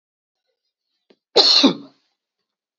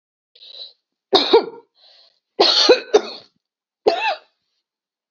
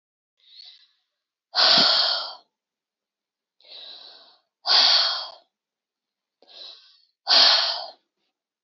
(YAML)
cough_length: 2.8 s
cough_amplitude: 29310
cough_signal_mean_std_ratio: 0.3
three_cough_length: 5.1 s
three_cough_amplitude: 32767
three_cough_signal_mean_std_ratio: 0.36
exhalation_length: 8.6 s
exhalation_amplitude: 22883
exhalation_signal_mean_std_ratio: 0.38
survey_phase: beta (2021-08-13 to 2022-03-07)
age: 45-64
gender: Female
wearing_mask: 'No'
symptom_none: true
smoker_status: Ex-smoker
respiratory_condition_asthma: false
respiratory_condition_other: false
recruitment_source: REACT
submission_delay: 3 days
covid_test_result: Negative
covid_test_method: RT-qPCR
influenza_a_test_result: Negative
influenza_b_test_result: Negative